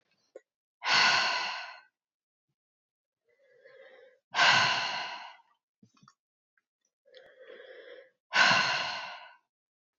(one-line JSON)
{"exhalation_length": "10.0 s", "exhalation_amplitude": 12090, "exhalation_signal_mean_std_ratio": 0.38, "survey_phase": "beta (2021-08-13 to 2022-03-07)", "age": "18-44", "gender": "Female", "wearing_mask": "No", "symptom_cough_any": true, "symptom_runny_or_blocked_nose": true, "symptom_sore_throat": true, "symptom_fever_high_temperature": true, "symptom_change_to_sense_of_smell_or_taste": true, "symptom_onset": "3 days", "smoker_status": "Never smoked", "respiratory_condition_asthma": false, "respiratory_condition_other": false, "recruitment_source": "Test and Trace", "submission_delay": "2 days", "covid_test_result": "Positive", "covid_test_method": "RT-qPCR", "covid_ct_value": 20.5, "covid_ct_gene": "ORF1ab gene", "covid_ct_mean": 20.7, "covid_viral_load": "160000 copies/ml", "covid_viral_load_category": "Low viral load (10K-1M copies/ml)"}